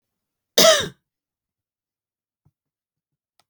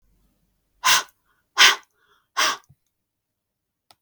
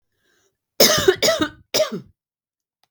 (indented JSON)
{
  "cough_length": "3.5 s",
  "cough_amplitude": 32768,
  "cough_signal_mean_std_ratio": 0.21,
  "exhalation_length": "4.0 s",
  "exhalation_amplitude": 32768,
  "exhalation_signal_mean_std_ratio": 0.27,
  "three_cough_length": "2.9 s",
  "three_cough_amplitude": 32768,
  "three_cough_signal_mean_std_ratio": 0.4,
  "survey_phase": "beta (2021-08-13 to 2022-03-07)",
  "age": "45-64",
  "gender": "Female",
  "wearing_mask": "No",
  "symptom_none": true,
  "smoker_status": "Never smoked",
  "respiratory_condition_asthma": false,
  "respiratory_condition_other": false,
  "recruitment_source": "REACT",
  "submission_delay": "2 days",
  "covid_test_result": "Negative",
  "covid_test_method": "RT-qPCR",
  "influenza_a_test_result": "Negative",
  "influenza_b_test_result": "Negative"
}